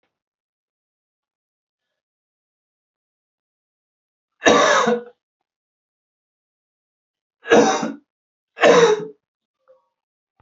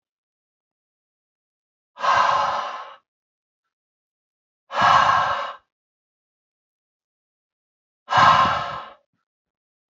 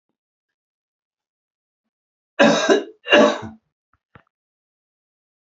{"three_cough_length": "10.4 s", "three_cough_amplitude": 32415, "three_cough_signal_mean_std_ratio": 0.28, "exhalation_length": "9.9 s", "exhalation_amplitude": 26043, "exhalation_signal_mean_std_ratio": 0.36, "cough_length": "5.5 s", "cough_amplitude": 27940, "cough_signal_mean_std_ratio": 0.28, "survey_phase": "beta (2021-08-13 to 2022-03-07)", "age": "18-44", "gender": "Male", "wearing_mask": "No", "symptom_cough_any": true, "symptom_new_continuous_cough": true, "symptom_runny_or_blocked_nose": true, "symptom_onset": "3 days", "smoker_status": "Prefer not to say", "respiratory_condition_asthma": false, "respiratory_condition_other": false, "recruitment_source": "Test and Trace", "submission_delay": "2 days", "covid_test_result": "Positive", "covid_test_method": "ePCR"}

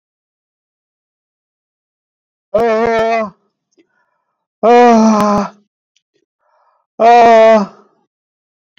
{"exhalation_length": "8.8 s", "exhalation_amplitude": 29021, "exhalation_signal_mean_std_ratio": 0.45, "survey_phase": "beta (2021-08-13 to 2022-03-07)", "age": "45-64", "gender": "Male", "wearing_mask": "No", "symptom_shortness_of_breath": true, "symptom_abdominal_pain": true, "symptom_diarrhoea": true, "symptom_fatigue": true, "symptom_headache": true, "smoker_status": "Never smoked", "respiratory_condition_asthma": false, "respiratory_condition_other": false, "recruitment_source": "REACT", "submission_delay": "1 day", "covid_test_result": "Negative", "covid_test_method": "RT-qPCR"}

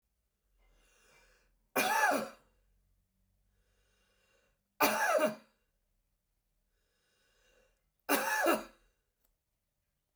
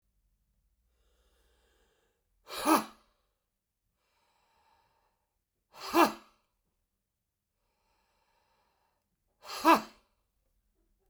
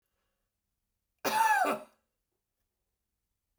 {"three_cough_length": "10.2 s", "three_cough_amplitude": 7291, "three_cough_signal_mean_std_ratio": 0.32, "exhalation_length": "11.1 s", "exhalation_amplitude": 11980, "exhalation_signal_mean_std_ratio": 0.19, "cough_length": "3.6 s", "cough_amplitude": 5671, "cough_signal_mean_std_ratio": 0.32, "survey_phase": "beta (2021-08-13 to 2022-03-07)", "age": "65+", "gender": "Male", "wearing_mask": "No", "symptom_cough_any": true, "symptom_runny_or_blocked_nose": true, "symptom_abdominal_pain": true, "symptom_diarrhoea": true, "symptom_fatigue": true, "symptom_onset": "12 days", "smoker_status": "Never smoked", "respiratory_condition_asthma": true, "respiratory_condition_other": false, "recruitment_source": "REACT", "submission_delay": "2 days", "covid_test_result": "Negative", "covid_test_method": "RT-qPCR"}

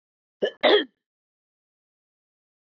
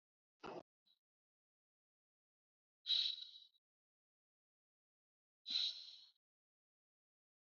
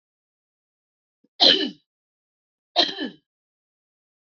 {"cough_length": "2.6 s", "cough_amplitude": 15369, "cough_signal_mean_std_ratio": 0.25, "exhalation_length": "7.4 s", "exhalation_amplitude": 1659, "exhalation_signal_mean_std_ratio": 0.25, "three_cough_length": "4.4 s", "three_cough_amplitude": 24792, "three_cough_signal_mean_std_ratio": 0.24, "survey_phase": "alpha (2021-03-01 to 2021-08-12)", "age": "45-64", "gender": "Female", "wearing_mask": "No", "symptom_cough_any": true, "symptom_shortness_of_breath": true, "symptom_fatigue": true, "symptom_headache": true, "symptom_change_to_sense_of_smell_or_taste": true, "symptom_loss_of_taste": true, "smoker_status": "Never smoked", "respiratory_condition_asthma": false, "respiratory_condition_other": false, "recruitment_source": "Test and Trace", "submission_delay": "1 day", "covid_test_result": "Positive", "covid_test_method": "RT-qPCR", "covid_ct_value": 18.4, "covid_ct_gene": "ORF1ab gene", "covid_ct_mean": 19.4, "covid_viral_load": "450000 copies/ml", "covid_viral_load_category": "Low viral load (10K-1M copies/ml)"}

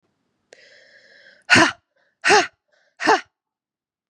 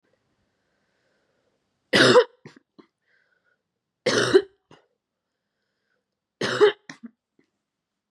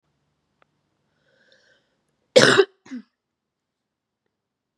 {"exhalation_length": "4.1 s", "exhalation_amplitude": 32117, "exhalation_signal_mean_std_ratio": 0.29, "three_cough_length": "8.1 s", "three_cough_amplitude": 24780, "three_cough_signal_mean_std_ratio": 0.26, "cough_length": "4.8 s", "cough_amplitude": 32767, "cough_signal_mean_std_ratio": 0.19, "survey_phase": "beta (2021-08-13 to 2022-03-07)", "age": "18-44", "gender": "Female", "wearing_mask": "No", "symptom_cough_any": true, "symptom_runny_or_blocked_nose": true, "symptom_shortness_of_breath": true, "symptom_sore_throat": true, "symptom_fatigue": true, "symptom_fever_high_temperature": true, "symptom_headache": true, "symptom_onset": "3 days", "smoker_status": "Never smoked", "respiratory_condition_asthma": true, "respiratory_condition_other": false, "recruitment_source": "Test and Trace", "submission_delay": "1 day", "covid_test_result": "Positive", "covid_test_method": "RT-qPCR", "covid_ct_value": 22.3, "covid_ct_gene": "N gene", "covid_ct_mean": 22.4, "covid_viral_load": "46000 copies/ml", "covid_viral_load_category": "Low viral load (10K-1M copies/ml)"}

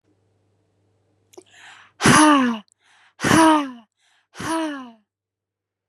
{"exhalation_length": "5.9 s", "exhalation_amplitude": 30550, "exhalation_signal_mean_std_ratio": 0.38, "survey_phase": "beta (2021-08-13 to 2022-03-07)", "age": "18-44", "gender": "Female", "wearing_mask": "No", "symptom_diarrhoea": true, "symptom_fatigue": true, "smoker_status": "Never smoked", "respiratory_condition_asthma": false, "respiratory_condition_other": false, "recruitment_source": "REACT", "submission_delay": "1 day", "covid_test_result": "Negative", "covid_test_method": "RT-qPCR"}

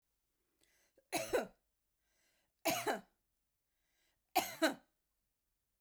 {"three_cough_length": "5.8 s", "three_cough_amplitude": 3931, "three_cough_signal_mean_std_ratio": 0.3, "survey_phase": "beta (2021-08-13 to 2022-03-07)", "age": "45-64", "gender": "Female", "wearing_mask": "No", "symptom_none": true, "smoker_status": "Never smoked", "respiratory_condition_asthma": false, "respiratory_condition_other": false, "recruitment_source": "REACT", "submission_delay": "1 day", "covid_test_result": "Negative", "covid_test_method": "RT-qPCR"}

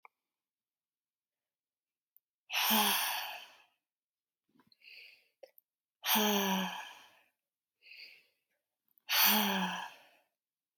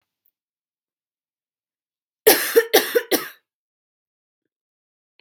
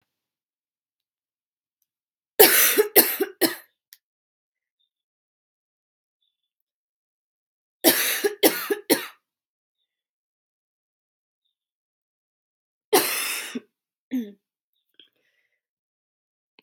{"exhalation_length": "10.8 s", "exhalation_amplitude": 6224, "exhalation_signal_mean_std_ratio": 0.38, "cough_length": "5.2 s", "cough_amplitude": 32768, "cough_signal_mean_std_ratio": 0.25, "three_cough_length": "16.6 s", "three_cough_amplitude": 32768, "three_cough_signal_mean_std_ratio": 0.25, "survey_phase": "beta (2021-08-13 to 2022-03-07)", "age": "18-44", "gender": "Female", "wearing_mask": "No", "symptom_runny_or_blocked_nose": true, "symptom_diarrhoea": true, "symptom_fatigue": true, "symptom_headache": true, "symptom_change_to_sense_of_smell_or_taste": true, "symptom_onset": "2 days", "smoker_status": "Never smoked", "respiratory_condition_asthma": false, "respiratory_condition_other": false, "recruitment_source": "Test and Trace", "submission_delay": "1 day", "covid_test_result": "Positive", "covid_test_method": "RT-qPCR", "covid_ct_value": 20.5, "covid_ct_gene": "ORF1ab gene", "covid_ct_mean": 21.5, "covid_viral_load": "90000 copies/ml", "covid_viral_load_category": "Low viral load (10K-1M copies/ml)"}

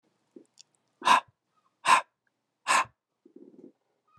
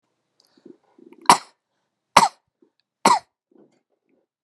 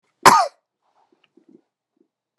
{"exhalation_length": "4.2 s", "exhalation_amplitude": 14515, "exhalation_signal_mean_std_ratio": 0.27, "three_cough_length": "4.4 s", "three_cough_amplitude": 32768, "three_cough_signal_mean_std_ratio": 0.2, "cough_length": "2.4 s", "cough_amplitude": 32768, "cough_signal_mean_std_ratio": 0.22, "survey_phase": "beta (2021-08-13 to 2022-03-07)", "age": "45-64", "gender": "Male", "wearing_mask": "No", "symptom_cough_any": true, "symptom_runny_or_blocked_nose": true, "symptom_sore_throat": true, "smoker_status": "Never smoked", "respiratory_condition_asthma": false, "respiratory_condition_other": false, "recruitment_source": "Test and Trace", "submission_delay": "3 days", "covid_test_result": "Positive", "covid_test_method": "RT-qPCR"}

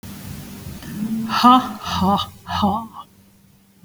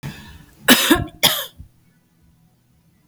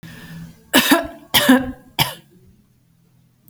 {"exhalation_length": "3.8 s", "exhalation_amplitude": 29149, "exhalation_signal_mean_std_ratio": 0.52, "cough_length": "3.1 s", "cough_amplitude": 32768, "cough_signal_mean_std_ratio": 0.33, "three_cough_length": "3.5 s", "three_cough_amplitude": 32768, "three_cough_signal_mean_std_ratio": 0.38, "survey_phase": "alpha (2021-03-01 to 2021-08-12)", "age": "45-64", "gender": "Female", "wearing_mask": "No", "symptom_none": true, "smoker_status": "Never smoked", "respiratory_condition_asthma": false, "respiratory_condition_other": false, "recruitment_source": "REACT", "submission_delay": "2 days", "covid_test_result": "Negative", "covid_test_method": "RT-qPCR"}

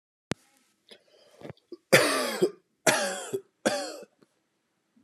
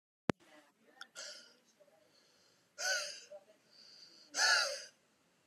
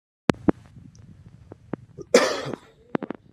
{"three_cough_length": "5.0 s", "three_cough_amplitude": 21662, "three_cough_signal_mean_std_ratio": 0.36, "exhalation_length": "5.5 s", "exhalation_amplitude": 6332, "exhalation_signal_mean_std_ratio": 0.33, "cough_length": "3.3 s", "cough_amplitude": 32160, "cough_signal_mean_std_ratio": 0.27, "survey_phase": "beta (2021-08-13 to 2022-03-07)", "age": "18-44", "gender": "Male", "wearing_mask": "No", "symptom_none": true, "smoker_status": "Never smoked", "respiratory_condition_asthma": false, "respiratory_condition_other": false, "recruitment_source": "REACT", "submission_delay": "1 day", "covid_test_result": "Negative", "covid_test_method": "RT-qPCR"}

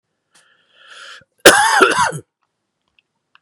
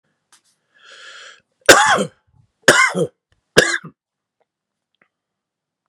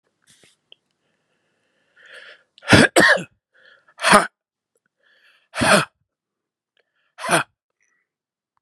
{"cough_length": "3.4 s", "cough_amplitude": 32768, "cough_signal_mean_std_ratio": 0.34, "three_cough_length": "5.9 s", "three_cough_amplitude": 32768, "three_cough_signal_mean_std_ratio": 0.29, "exhalation_length": "8.6 s", "exhalation_amplitude": 32768, "exhalation_signal_mean_std_ratio": 0.27, "survey_phase": "beta (2021-08-13 to 2022-03-07)", "age": "45-64", "gender": "Male", "wearing_mask": "No", "symptom_runny_or_blocked_nose": true, "symptom_fever_high_temperature": true, "symptom_headache": true, "smoker_status": "Never smoked", "respiratory_condition_asthma": true, "respiratory_condition_other": true, "recruitment_source": "Test and Trace", "submission_delay": "2 days", "covid_test_result": "Positive", "covid_test_method": "RT-qPCR"}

